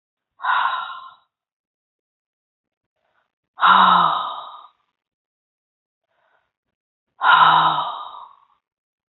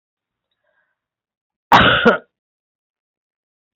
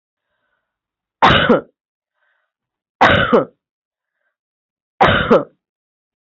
{"exhalation_length": "9.1 s", "exhalation_amplitude": 29443, "exhalation_signal_mean_std_ratio": 0.36, "cough_length": "3.8 s", "cough_amplitude": 32767, "cough_signal_mean_std_ratio": 0.27, "three_cough_length": "6.3 s", "three_cough_amplitude": 32768, "three_cough_signal_mean_std_ratio": 0.34, "survey_phase": "beta (2021-08-13 to 2022-03-07)", "age": "65+", "gender": "Female", "wearing_mask": "No", "symptom_none": true, "smoker_status": "Never smoked", "respiratory_condition_asthma": false, "respiratory_condition_other": false, "recruitment_source": "REACT", "submission_delay": "0 days", "covid_test_result": "Negative", "covid_test_method": "RT-qPCR"}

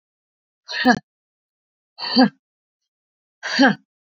{"exhalation_length": "4.2 s", "exhalation_amplitude": 27742, "exhalation_signal_mean_std_ratio": 0.31, "survey_phase": "beta (2021-08-13 to 2022-03-07)", "age": "45-64", "gender": "Female", "wearing_mask": "No", "symptom_cough_any": true, "symptom_sore_throat": true, "symptom_fatigue": true, "symptom_headache": true, "symptom_onset": "3 days", "smoker_status": "Ex-smoker", "respiratory_condition_asthma": true, "respiratory_condition_other": false, "recruitment_source": "Test and Trace", "submission_delay": "2 days", "covid_test_result": "Positive", "covid_test_method": "RT-qPCR"}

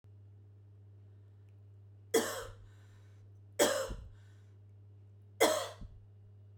{"three_cough_length": "6.6 s", "three_cough_amplitude": 6798, "three_cough_signal_mean_std_ratio": 0.38, "survey_phase": "beta (2021-08-13 to 2022-03-07)", "age": "45-64", "gender": "Female", "wearing_mask": "No", "symptom_none": true, "smoker_status": "Current smoker (1 to 10 cigarettes per day)", "respiratory_condition_asthma": false, "respiratory_condition_other": false, "recruitment_source": "REACT", "submission_delay": "14 days", "covid_test_result": "Negative", "covid_test_method": "RT-qPCR"}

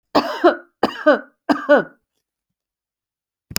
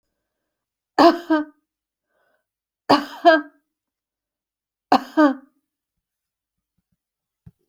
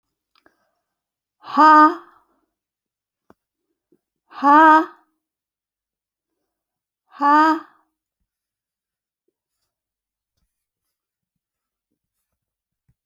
{"cough_length": "3.6 s", "cough_amplitude": 32768, "cough_signal_mean_std_ratio": 0.35, "three_cough_length": "7.7 s", "three_cough_amplitude": 28588, "three_cough_signal_mean_std_ratio": 0.26, "exhalation_length": "13.1 s", "exhalation_amplitude": 28532, "exhalation_signal_mean_std_ratio": 0.24, "survey_phase": "beta (2021-08-13 to 2022-03-07)", "age": "65+", "gender": "Female", "wearing_mask": "No", "symptom_none": true, "smoker_status": "Never smoked", "respiratory_condition_asthma": false, "respiratory_condition_other": false, "recruitment_source": "REACT", "submission_delay": "2 days", "covid_test_result": "Negative", "covid_test_method": "RT-qPCR"}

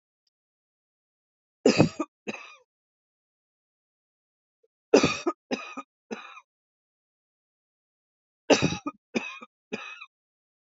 {"three_cough_length": "10.7 s", "three_cough_amplitude": 25227, "three_cough_signal_mean_std_ratio": 0.23, "survey_phase": "beta (2021-08-13 to 2022-03-07)", "age": "45-64", "gender": "Female", "wearing_mask": "No", "symptom_none": true, "smoker_status": "Ex-smoker", "respiratory_condition_asthma": false, "respiratory_condition_other": false, "recruitment_source": "REACT", "submission_delay": "4 days", "covid_test_result": "Negative", "covid_test_method": "RT-qPCR", "influenza_a_test_result": "Negative", "influenza_b_test_result": "Negative"}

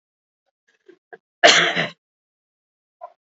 {"cough_length": "3.2 s", "cough_amplitude": 31327, "cough_signal_mean_std_ratio": 0.26, "survey_phase": "alpha (2021-03-01 to 2021-08-12)", "age": "65+", "gender": "Female", "wearing_mask": "No", "symptom_none": true, "smoker_status": "Ex-smoker", "respiratory_condition_asthma": false, "respiratory_condition_other": false, "recruitment_source": "REACT", "submission_delay": "3 days", "covid_test_result": "Negative", "covid_test_method": "RT-qPCR"}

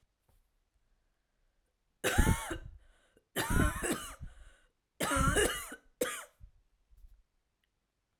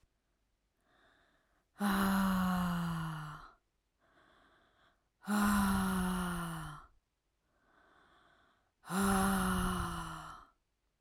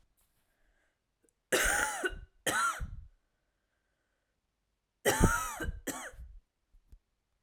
{"three_cough_length": "8.2 s", "three_cough_amplitude": 8582, "three_cough_signal_mean_std_ratio": 0.39, "exhalation_length": "11.0 s", "exhalation_amplitude": 3496, "exhalation_signal_mean_std_ratio": 0.57, "cough_length": "7.4 s", "cough_amplitude": 9094, "cough_signal_mean_std_ratio": 0.39, "survey_phase": "alpha (2021-03-01 to 2021-08-12)", "age": "18-44", "gender": "Female", "wearing_mask": "No", "symptom_cough_any": true, "symptom_new_continuous_cough": true, "smoker_status": "Ex-smoker", "respiratory_condition_asthma": false, "respiratory_condition_other": false, "recruitment_source": "REACT", "submission_delay": "1 day", "covid_test_result": "Negative", "covid_test_method": "RT-qPCR"}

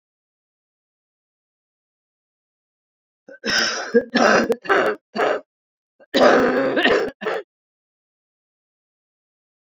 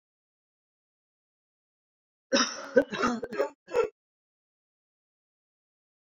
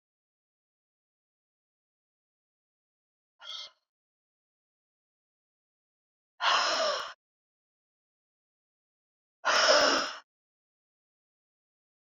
{"three_cough_length": "9.7 s", "three_cough_amplitude": 27093, "three_cough_signal_mean_std_ratio": 0.4, "cough_length": "6.1 s", "cough_amplitude": 12593, "cough_signal_mean_std_ratio": 0.28, "exhalation_length": "12.0 s", "exhalation_amplitude": 10180, "exhalation_signal_mean_std_ratio": 0.26, "survey_phase": "beta (2021-08-13 to 2022-03-07)", "age": "65+", "gender": "Female", "wearing_mask": "No", "symptom_cough_any": true, "symptom_runny_or_blocked_nose": true, "symptom_shortness_of_breath": true, "symptom_fatigue": true, "symptom_headache": true, "symptom_change_to_sense_of_smell_or_taste": true, "symptom_other": true, "symptom_onset": "5 days", "smoker_status": "Ex-smoker", "respiratory_condition_asthma": false, "respiratory_condition_other": false, "recruitment_source": "Test and Trace", "submission_delay": "2 days", "covid_test_result": "Positive", "covid_test_method": "RT-qPCR", "covid_ct_value": 20.0, "covid_ct_gene": "ORF1ab gene"}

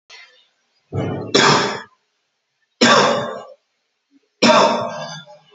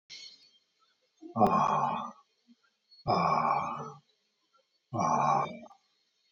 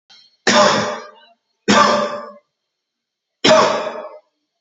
{"three_cough_length": "5.5 s", "three_cough_amplitude": 29371, "three_cough_signal_mean_std_ratio": 0.46, "exhalation_length": "6.3 s", "exhalation_amplitude": 10938, "exhalation_signal_mean_std_ratio": 0.49, "cough_length": "4.6 s", "cough_amplitude": 31572, "cough_signal_mean_std_ratio": 0.47, "survey_phase": "alpha (2021-03-01 to 2021-08-12)", "age": "65+", "gender": "Male", "wearing_mask": "No", "symptom_none": true, "smoker_status": "Ex-smoker", "respiratory_condition_asthma": false, "respiratory_condition_other": false, "recruitment_source": "REACT", "submission_delay": "3 days", "covid_test_result": "Negative", "covid_test_method": "RT-qPCR"}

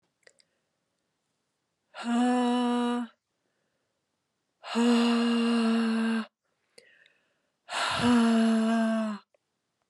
{"exhalation_length": "9.9 s", "exhalation_amplitude": 7438, "exhalation_signal_mean_std_ratio": 0.59, "survey_phase": "alpha (2021-03-01 to 2021-08-12)", "age": "45-64", "gender": "Female", "wearing_mask": "No", "symptom_cough_any": true, "symptom_abdominal_pain": true, "symptom_fatigue": true, "symptom_headache": true, "symptom_change_to_sense_of_smell_or_taste": true, "smoker_status": "Never smoked", "respiratory_condition_asthma": false, "respiratory_condition_other": false, "recruitment_source": "Test and Trace", "submission_delay": "2 days", "covid_test_result": "Positive", "covid_test_method": "RT-qPCR", "covid_ct_value": 15.7, "covid_ct_gene": "ORF1ab gene", "covid_ct_mean": 16.1, "covid_viral_load": "5200000 copies/ml", "covid_viral_load_category": "High viral load (>1M copies/ml)"}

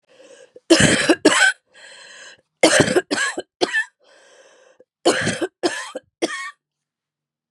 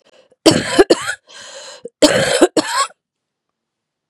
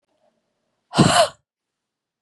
{"three_cough_length": "7.5 s", "three_cough_amplitude": 32767, "three_cough_signal_mean_std_ratio": 0.42, "cough_length": "4.1 s", "cough_amplitude": 32768, "cough_signal_mean_std_ratio": 0.41, "exhalation_length": "2.2 s", "exhalation_amplitude": 29756, "exhalation_signal_mean_std_ratio": 0.3, "survey_phase": "beta (2021-08-13 to 2022-03-07)", "age": "45-64", "gender": "Female", "wearing_mask": "No", "symptom_cough_any": true, "symptom_shortness_of_breath": true, "symptom_fatigue": true, "symptom_headache": true, "symptom_change_to_sense_of_smell_or_taste": true, "symptom_loss_of_taste": true, "smoker_status": "Never smoked", "respiratory_condition_asthma": false, "respiratory_condition_other": false, "recruitment_source": "Test and Trace", "submission_delay": "2 days", "covid_test_result": "Positive", "covid_test_method": "RT-qPCR", "covid_ct_value": 22.6, "covid_ct_gene": "ORF1ab gene"}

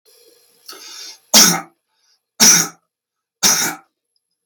{"three_cough_length": "4.5 s", "three_cough_amplitude": 32768, "three_cough_signal_mean_std_ratio": 0.35, "survey_phase": "beta (2021-08-13 to 2022-03-07)", "age": "45-64", "gender": "Male", "wearing_mask": "No", "symptom_none": true, "smoker_status": "Ex-smoker", "respiratory_condition_asthma": false, "respiratory_condition_other": false, "recruitment_source": "REACT", "submission_delay": "1 day", "covid_test_result": "Negative", "covid_test_method": "RT-qPCR"}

